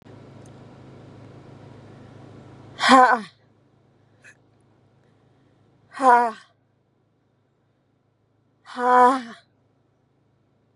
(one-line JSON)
{"exhalation_length": "10.8 s", "exhalation_amplitude": 32048, "exhalation_signal_mean_std_ratio": 0.26, "survey_phase": "beta (2021-08-13 to 2022-03-07)", "age": "18-44", "gender": "Female", "wearing_mask": "No", "symptom_none": true, "smoker_status": "Current smoker (e-cigarettes or vapes only)", "respiratory_condition_asthma": false, "respiratory_condition_other": false, "recruitment_source": "REACT", "submission_delay": "0 days", "covid_test_result": "Negative", "covid_test_method": "RT-qPCR", "influenza_a_test_result": "Negative", "influenza_b_test_result": "Negative"}